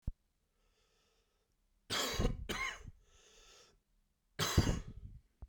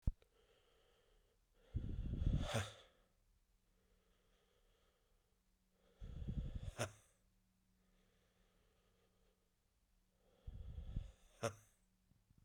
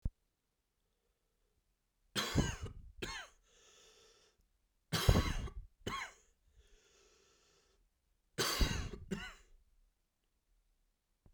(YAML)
cough_length: 5.5 s
cough_amplitude: 5943
cough_signal_mean_std_ratio: 0.39
exhalation_length: 12.4 s
exhalation_amplitude: 2225
exhalation_signal_mean_std_ratio: 0.34
three_cough_length: 11.3 s
three_cough_amplitude: 7325
three_cough_signal_mean_std_ratio: 0.32
survey_phase: beta (2021-08-13 to 2022-03-07)
age: 18-44
gender: Male
wearing_mask: 'No'
symptom_cough_any: true
symptom_sore_throat: true
symptom_fatigue: true
symptom_fever_high_temperature: true
symptom_headache: true
smoker_status: Ex-smoker
respiratory_condition_asthma: false
respiratory_condition_other: false
recruitment_source: Test and Trace
submission_delay: 2 days
covid_test_result: Positive
covid_test_method: LFT